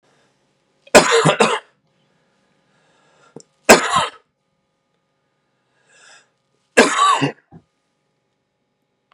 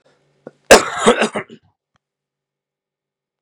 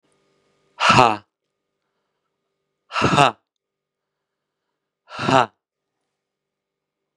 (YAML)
three_cough_length: 9.1 s
three_cough_amplitude: 32768
three_cough_signal_mean_std_ratio: 0.29
cough_length: 3.4 s
cough_amplitude: 32768
cough_signal_mean_std_ratio: 0.26
exhalation_length: 7.2 s
exhalation_amplitude: 32767
exhalation_signal_mean_std_ratio: 0.25
survey_phase: beta (2021-08-13 to 2022-03-07)
age: 45-64
gender: Male
wearing_mask: 'No'
symptom_cough_any: true
symptom_new_continuous_cough: true
symptom_runny_or_blocked_nose: true
symptom_sore_throat: true
symptom_fatigue: true
symptom_change_to_sense_of_smell_or_taste: true
symptom_onset: 3 days
smoker_status: Ex-smoker
respiratory_condition_asthma: false
respiratory_condition_other: false
recruitment_source: Test and Trace
submission_delay: 2 days
covid_test_result: Positive
covid_test_method: RT-qPCR
covid_ct_value: 22.3
covid_ct_gene: ORF1ab gene
covid_ct_mean: 22.7
covid_viral_load: 36000 copies/ml
covid_viral_load_category: Low viral load (10K-1M copies/ml)